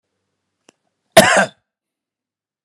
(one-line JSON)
{"cough_length": "2.6 s", "cough_amplitude": 32768, "cough_signal_mean_std_ratio": 0.25, "survey_phase": "beta (2021-08-13 to 2022-03-07)", "age": "45-64", "gender": "Male", "wearing_mask": "No", "symptom_fatigue": true, "symptom_onset": "13 days", "smoker_status": "Never smoked", "respiratory_condition_asthma": false, "respiratory_condition_other": false, "recruitment_source": "REACT", "submission_delay": "7 days", "covid_test_result": "Negative", "covid_test_method": "RT-qPCR"}